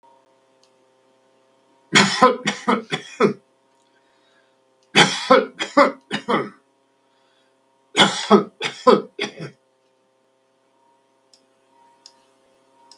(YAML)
three_cough_length: 13.0 s
three_cough_amplitude: 32768
three_cough_signal_mean_std_ratio: 0.31
survey_phase: beta (2021-08-13 to 2022-03-07)
age: 65+
gender: Male
wearing_mask: 'No'
symptom_none: true
symptom_onset: 12 days
smoker_status: Never smoked
respiratory_condition_asthma: false
respiratory_condition_other: false
recruitment_source: REACT
submission_delay: 3 days
covid_test_result: Negative
covid_test_method: RT-qPCR
influenza_a_test_result: Negative
influenza_b_test_result: Negative